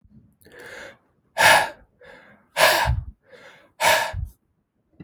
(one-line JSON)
{"exhalation_length": "5.0 s", "exhalation_amplitude": 30833, "exhalation_signal_mean_std_ratio": 0.39, "survey_phase": "beta (2021-08-13 to 2022-03-07)", "age": "65+", "gender": "Male", "wearing_mask": "No", "symptom_cough_any": true, "symptom_onset": "5 days", "smoker_status": "Never smoked", "respiratory_condition_asthma": false, "respiratory_condition_other": false, "recruitment_source": "REACT", "submission_delay": "1 day", "covid_test_result": "Positive", "covid_test_method": "RT-qPCR", "covid_ct_value": 20.8, "covid_ct_gene": "E gene", "influenza_a_test_result": "Negative", "influenza_b_test_result": "Negative"}